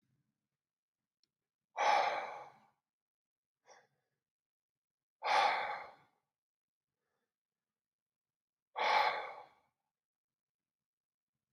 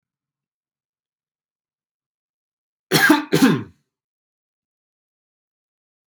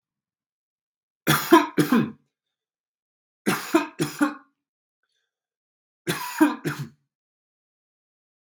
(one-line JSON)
{"exhalation_length": "11.5 s", "exhalation_amplitude": 3845, "exhalation_signal_mean_std_ratio": 0.3, "cough_length": "6.1 s", "cough_amplitude": 29479, "cough_signal_mean_std_ratio": 0.24, "three_cough_length": "8.4 s", "three_cough_amplitude": 25131, "three_cough_signal_mean_std_ratio": 0.31, "survey_phase": "beta (2021-08-13 to 2022-03-07)", "age": "18-44", "gender": "Male", "wearing_mask": "No", "symptom_none": true, "smoker_status": "Never smoked", "respiratory_condition_asthma": true, "respiratory_condition_other": false, "recruitment_source": "REACT", "submission_delay": "1 day", "covid_test_result": "Negative", "covid_test_method": "RT-qPCR", "influenza_a_test_result": "Negative", "influenza_b_test_result": "Negative"}